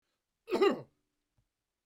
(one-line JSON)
{"cough_length": "1.9 s", "cough_amplitude": 5813, "cough_signal_mean_std_ratio": 0.3, "survey_phase": "beta (2021-08-13 to 2022-03-07)", "age": "65+", "gender": "Male", "wearing_mask": "No", "symptom_none": true, "smoker_status": "Never smoked", "respiratory_condition_asthma": false, "respiratory_condition_other": false, "recruitment_source": "REACT", "submission_delay": "1 day", "covid_test_result": "Negative", "covid_test_method": "RT-qPCR"}